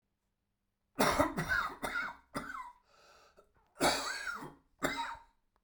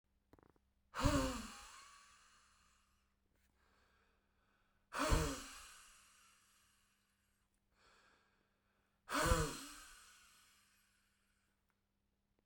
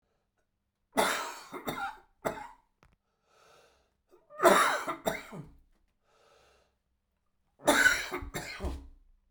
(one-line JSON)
{"cough_length": "5.6 s", "cough_amplitude": 7659, "cough_signal_mean_std_ratio": 0.48, "exhalation_length": "12.5 s", "exhalation_amplitude": 3543, "exhalation_signal_mean_std_ratio": 0.29, "three_cough_length": "9.3 s", "three_cough_amplitude": 13110, "three_cough_signal_mean_std_ratio": 0.35, "survey_phase": "beta (2021-08-13 to 2022-03-07)", "age": "45-64", "gender": "Male", "wearing_mask": "No", "symptom_cough_any": true, "symptom_new_continuous_cough": true, "symptom_runny_or_blocked_nose": true, "symptom_shortness_of_breath": true, "symptom_abdominal_pain": true, "symptom_fatigue": true, "symptom_fever_high_temperature": true, "symptom_headache": true, "symptom_change_to_sense_of_smell_or_taste": true, "symptom_loss_of_taste": true, "smoker_status": "Never smoked", "respiratory_condition_asthma": false, "respiratory_condition_other": false, "recruitment_source": "Test and Trace", "submission_delay": "2 days", "covid_test_result": "Positive", "covid_test_method": "LFT"}